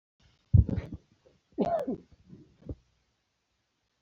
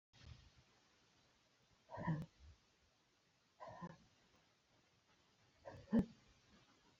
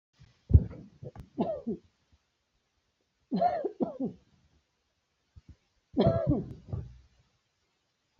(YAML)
cough_length: 4.0 s
cough_amplitude: 10997
cough_signal_mean_std_ratio: 0.27
exhalation_length: 7.0 s
exhalation_amplitude: 1487
exhalation_signal_mean_std_ratio: 0.26
three_cough_length: 8.2 s
three_cough_amplitude: 15631
three_cough_signal_mean_std_ratio: 0.32
survey_phase: beta (2021-08-13 to 2022-03-07)
age: 65+
gender: Female
wearing_mask: 'No'
symptom_none: true
smoker_status: Never smoked
respiratory_condition_asthma: false
respiratory_condition_other: false
recruitment_source: REACT
submission_delay: 2 days
covid_test_result: Negative
covid_test_method: RT-qPCR
influenza_a_test_result: Negative
influenza_b_test_result: Negative